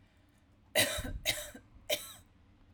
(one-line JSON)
{"three_cough_length": "2.7 s", "three_cough_amplitude": 6807, "three_cough_signal_mean_std_ratio": 0.42, "survey_phase": "alpha (2021-03-01 to 2021-08-12)", "age": "18-44", "gender": "Female", "wearing_mask": "No", "symptom_fatigue": true, "smoker_status": "Prefer not to say", "respiratory_condition_asthma": false, "respiratory_condition_other": false, "recruitment_source": "REACT", "submission_delay": "2 days", "covid_test_result": "Negative", "covid_test_method": "RT-qPCR"}